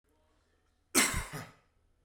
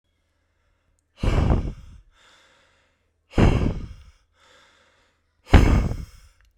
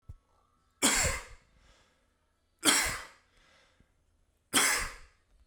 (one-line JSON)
{"cough_length": "2.0 s", "cough_amplitude": 8756, "cough_signal_mean_std_ratio": 0.32, "exhalation_length": "6.6 s", "exhalation_amplitude": 32767, "exhalation_signal_mean_std_ratio": 0.35, "three_cough_length": "5.5 s", "three_cough_amplitude": 12264, "three_cough_signal_mean_std_ratio": 0.37, "survey_phase": "beta (2021-08-13 to 2022-03-07)", "age": "18-44", "gender": "Male", "wearing_mask": "No", "symptom_none": true, "smoker_status": "Never smoked", "respiratory_condition_asthma": false, "respiratory_condition_other": false, "recruitment_source": "REACT", "submission_delay": "2 days", "covid_test_result": "Negative", "covid_test_method": "RT-qPCR"}